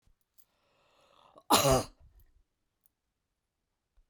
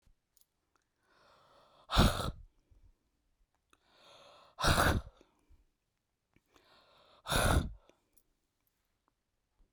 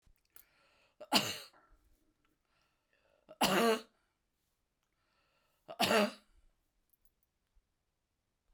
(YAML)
cough_length: 4.1 s
cough_amplitude: 11648
cough_signal_mean_std_ratio: 0.23
exhalation_length: 9.7 s
exhalation_amplitude: 7360
exhalation_signal_mean_std_ratio: 0.28
three_cough_length: 8.5 s
three_cough_amplitude: 6507
three_cough_signal_mean_std_ratio: 0.27
survey_phase: beta (2021-08-13 to 2022-03-07)
age: 65+
gender: Female
wearing_mask: 'No'
symptom_none: true
smoker_status: Never smoked
respiratory_condition_asthma: false
respiratory_condition_other: false
recruitment_source: REACT
submission_delay: 1 day
covid_test_method: RT-qPCR